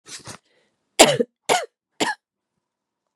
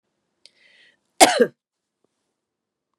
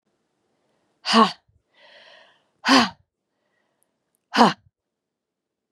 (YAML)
three_cough_length: 3.2 s
three_cough_amplitude: 32768
three_cough_signal_mean_std_ratio: 0.27
cough_length: 3.0 s
cough_amplitude: 32768
cough_signal_mean_std_ratio: 0.2
exhalation_length: 5.7 s
exhalation_amplitude: 32767
exhalation_signal_mean_std_ratio: 0.25
survey_phase: beta (2021-08-13 to 2022-03-07)
age: 45-64
gender: Female
wearing_mask: 'No'
symptom_runny_or_blocked_nose: true
symptom_fatigue: true
symptom_other: true
symptom_onset: 3 days
smoker_status: Never smoked
respiratory_condition_asthma: false
respiratory_condition_other: false
recruitment_source: Test and Trace
submission_delay: 2 days
covid_test_result: Positive
covid_test_method: RT-qPCR
covid_ct_value: 16.9
covid_ct_gene: ORF1ab gene
covid_ct_mean: 18.0
covid_viral_load: 1300000 copies/ml
covid_viral_load_category: High viral load (>1M copies/ml)